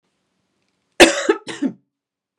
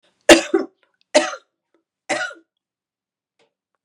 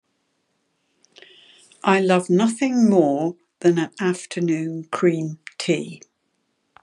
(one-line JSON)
{"cough_length": "2.4 s", "cough_amplitude": 32768, "cough_signal_mean_std_ratio": 0.27, "three_cough_length": "3.8 s", "three_cough_amplitude": 32768, "three_cough_signal_mean_std_ratio": 0.24, "exhalation_length": "6.8 s", "exhalation_amplitude": 27016, "exhalation_signal_mean_std_ratio": 0.54, "survey_phase": "beta (2021-08-13 to 2022-03-07)", "age": "65+", "gender": "Female", "wearing_mask": "No", "symptom_none": true, "smoker_status": "Never smoked", "respiratory_condition_asthma": false, "respiratory_condition_other": false, "recruitment_source": "REACT", "submission_delay": "2 days", "covid_test_result": "Negative", "covid_test_method": "RT-qPCR", "influenza_a_test_result": "Negative", "influenza_b_test_result": "Negative"}